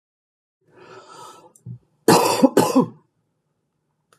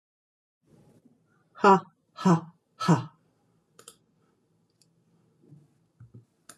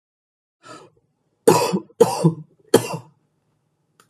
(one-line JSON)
{"cough_length": "4.2 s", "cough_amplitude": 29398, "cough_signal_mean_std_ratio": 0.32, "exhalation_length": "6.6 s", "exhalation_amplitude": 14289, "exhalation_signal_mean_std_ratio": 0.23, "three_cough_length": "4.1 s", "three_cough_amplitude": 32767, "three_cough_signal_mean_std_ratio": 0.31, "survey_phase": "alpha (2021-03-01 to 2021-08-12)", "age": "45-64", "gender": "Female", "wearing_mask": "No", "symptom_cough_any": true, "smoker_status": "Current smoker (11 or more cigarettes per day)", "respiratory_condition_asthma": false, "respiratory_condition_other": false, "recruitment_source": "Test and Trace", "submission_delay": "2 days", "covid_test_result": "Positive", "covid_test_method": "RT-qPCR", "covid_ct_value": 27.1, "covid_ct_gene": "ORF1ab gene", "covid_ct_mean": 27.9, "covid_viral_load": "690 copies/ml", "covid_viral_load_category": "Minimal viral load (< 10K copies/ml)"}